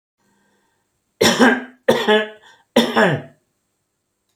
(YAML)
three_cough_length: 4.4 s
three_cough_amplitude: 28178
three_cough_signal_mean_std_ratio: 0.41
survey_phase: alpha (2021-03-01 to 2021-08-12)
age: 45-64
gender: Male
wearing_mask: 'No'
symptom_none: true
smoker_status: Never smoked
respiratory_condition_asthma: false
respiratory_condition_other: false
recruitment_source: REACT
submission_delay: 2 days
covid_test_result: Negative
covid_test_method: RT-qPCR